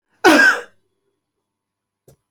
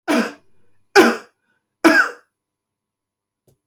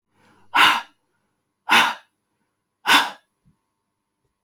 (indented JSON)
{
  "cough_length": "2.3 s",
  "cough_amplitude": 31882,
  "cough_signal_mean_std_ratio": 0.32,
  "three_cough_length": "3.7 s",
  "three_cough_amplitude": 30249,
  "three_cough_signal_mean_std_ratio": 0.33,
  "exhalation_length": "4.4 s",
  "exhalation_amplitude": 26588,
  "exhalation_signal_mean_std_ratio": 0.31,
  "survey_phase": "beta (2021-08-13 to 2022-03-07)",
  "age": "65+",
  "gender": "Male",
  "wearing_mask": "No",
  "symptom_none": true,
  "smoker_status": "Never smoked",
  "respiratory_condition_asthma": false,
  "respiratory_condition_other": false,
  "recruitment_source": "REACT",
  "submission_delay": "1 day",
  "covid_test_result": "Negative",
  "covid_test_method": "RT-qPCR"
}